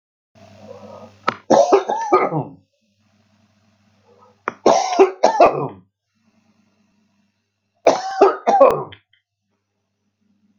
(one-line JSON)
{"three_cough_length": "10.6 s", "three_cough_amplitude": 32768, "three_cough_signal_mean_std_ratio": 0.36, "survey_phase": "beta (2021-08-13 to 2022-03-07)", "age": "45-64", "gender": "Male", "wearing_mask": "No", "symptom_none": true, "smoker_status": "Ex-smoker", "respiratory_condition_asthma": false, "respiratory_condition_other": false, "recruitment_source": "REACT", "submission_delay": "8 days", "covid_test_result": "Negative", "covid_test_method": "RT-qPCR"}